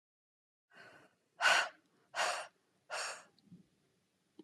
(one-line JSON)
{"exhalation_length": "4.4 s", "exhalation_amplitude": 5121, "exhalation_signal_mean_std_ratio": 0.32, "survey_phase": "beta (2021-08-13 to 2022-03-07)", "age": "45-64", "gender": "Female", "wearing_mask": "No", "symptom_fatigue": true, "smoker_status": "Ex-smoker", "respiratory_condition_asthma": false, "respiratory_condition_other": false, "recruitment_source": "REACT", "submission_delay": "1 day", "covid_test_result": "Negative", "covid_test_method": "RT-qPCR"}